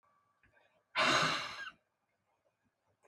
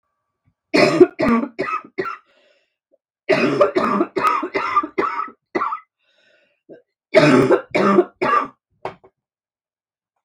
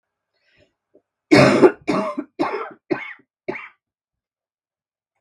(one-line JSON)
{"exhalation_length": "3.1 s", "exhalation_amplitude": 4701, "exhalation_signal_mean_std_ratio": 0.36, "three_cough_length": "10.2 s", "three_cough_amplitude": 32768, "three_cough_signal_mean_std_ratio": 0.48, "cough_length": "5.2 s", "cough_amplitude": 32767, "cough_signal_mean_std_ratio": 0.32, "survey_phase": "beta (2021-08-13 to 2022-03-07)", "age": "45-64", "gender": "Female", "wearing_mask": "No", "symptom_cough_any": true, "symptom_runny_or_blocked_nose": true, "symptom_fatigue": true, "symptom_fever_high_temperature": true, "symptom_headache": true, "symptom_change_to_sense_of_smell_or_taste": true, "symptom_loss_of_taste": true, "symptom_onset": "3 days", "smoker_status": "Never smoked", "respiratory_condition_asthma": false, "respiratory_condition_other": false, "recruitment_source": "Test and Trace", "submission_delay": "2 days", "covid_test_result": "Positive", "covid_test_method": "RT-qPCR", "covid_ct_value": 19.0, "covid_ct_gene": "ORF1ab gene", "covid_ct_mean": 19.5, "covid_viral_load": "410000 copies/ml", "covid_viral_load_category": "Low viral load (10K-1M copies/ml)"}